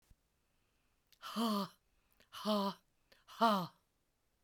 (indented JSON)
{
  "exhalation_length": "4.4 s",
  "exhalation_amplitude": 3380,
  "exhalation_signal_mean_std_ratio": 0.39,
  "survey_phase": "beta (2021-08-13 to 2022-03-07)",
  "age": "45-64",
  "gender": "Female",
  "wearing_mask": "No",
  "symptom_cough_any": true,
  "symptom_sore_throat": true,
  "symptom_onset": "6 days",
  "smoker_status": "Never smoked",
  "respiratory_condition_asthma": false,
  "respiratory_condition_other": false,
  "recruitment_source": "Test and Trace",
  "submission_delay": "1 day",
  "covid_test_result": "Negative",
  "covid_test_method": "RT-qPCR"
}